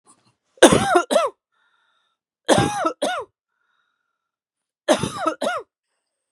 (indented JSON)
{
  "three_cough_length": "6.3 s",
  "three_cough_amplitude": 32768,
  "three_cough_signal_mean_std_ratio": 0.36,
  "survey_phase": "beta (2021-08-13 to 2022-03-07)",
  "age": "18-44",
  "gender": "Female",
  "wearing_mask": "No",
  "symptom_none": true,
  "smoker_status": "Ex-smoker",
  "respiratory_condition_asthma": false,
  "respiratory_condition_other": false,
  "recruitment_source": "REACT",
  "submission_delay": "1 day",
  "covid_test_result": "Negative",
  "covid_test_method": "RT-qPCR",
  "influenza_a_test_result": "Negative",
  "influenza_b_test_result": "Negative"
}